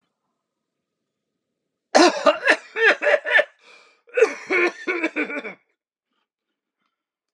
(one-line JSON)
{"cough_length": "7.3 s", "cough_amplitude": 30478, "cough_signal_mean_std_ratio": 0.38, "survey_phase": "beta (2021-08-13 to 2022-03-07)", "age": "65+", "gender": "Male", "wearing_mask": "No", "symptom_none": true, "smoker_status": "Never smoked", "respiratory_condition_asthma": false, "respiratory_condition_other": false, "recruitment_source": "REACT", "submission_delay": "1 day", "covid_test_result": "Negative", "covid_test_method": "RT-qPCR", "influenza_a_test_result": "Negative", "influenza_b_test_result": "Negative"}